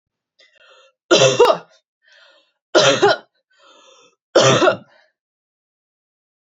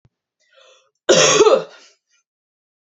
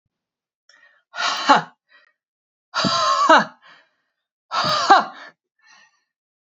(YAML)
three_cough_length: 6.5 s
three_cough_amplitude: 30466
three_cough_signal_mean_std_ratio: 0.35
cough_length: 3.0 s
cough_amplitude: 32465
cough_signal_mean_std_ratio: 0.35
exhalation_length: 6.5 s
exhalation_amplitude: 28598
exhalation_signal_mean_std_ratio: 0.37
survey_phase: beta (2021-08-13 to 2022-03-07)
age: 45-64
gender: Female
wearing_mask: 'No'
symptom_none: true
smoker_status: Ex-smoker
respiratory_condition_asthma: false
respiratory_condition_other: false
recruitment_source: REACT
submission_delay: 1 day
covid_test_result: Negative
covid_test_method: RT-qPCR